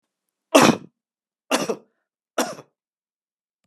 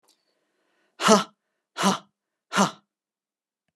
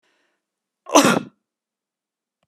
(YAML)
three_cough_length: 3.7 s
three_cough_amplitude: 30878
three_cough_signal_mean_std_ratio: 0.26
exhalation_length: 3.8 s
exhalation_amplitude: 27341
exhalation_signal_mean_std_ratio: 0.28
cough_length: 2.5 s
cough_amplitude: 32626
cough_signal_mean_std_ratio: 0.25
survey_phase: beta (2021-08-13 to 2022-03-07)
age: 65+
gender: Male
wearing_mask: 'No'
symptom_none: true
smoker_status: Never smoked
respiratory_condition_asthma: false
respiratory_condition_other: false
recruitment_source: REACT
submission_delay: 2 days
covid_test_result: Negative
covid_test_method: RT-qPCR